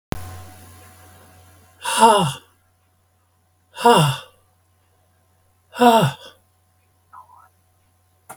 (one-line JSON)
{"exhalation_length": "8.4 s", "exhalation_amplitude": 32768, "exhalation_signal_mean_std_ratio": 0.31, "survey_phase": "beta (2021-08-13 to 2022-03-07)", "age": "65+", "gender": "Male", "wearing_mask": "No", "symptom_diarrhoea": true, "smoker_status": "Never smoked", "respiratory_condition_asthma": false, "respiratory_condition_other": false, "recruitment_source": "REACT", "submission_delay": "2 days", "covid_test_result": "Negative", "covid_test_method": "RT-qPCR", "influenza_a_test_result": "Negative", "influenza_b_test_result": "Negative"}